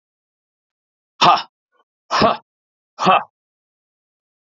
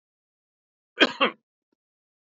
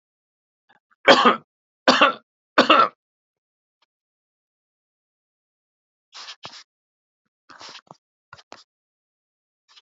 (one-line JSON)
{"exhalation_length": "4.4 s", "exhalation_amplitude": 28615, "exhalation_signal_mean_std_ratio": 0.29, "cough_length": "2.4 s", "cough_amplitude": 19856, "cough_signal_mean_std_ratio": 0.2, "three_cough_length": "9.8 s", "three_cough_amplitude": 32767, "three_cough_signal_mean_std_ratio": 0.22, "survey_phase": "alpha (2021-03-01 to 2021-08-12)", "age": "45-64", "gender": "Male", "wearing_mask": "No", "symptom_none": true, "smoker_status": "Ex-smoker", "respiratory_condition_asthma": false, "respiratory_condition_other": false, "recruitment_source": "REACT", "submission_delay": "2 days", "covid_test_result": "Negative", "covid_test_method": "RT-qPCR"}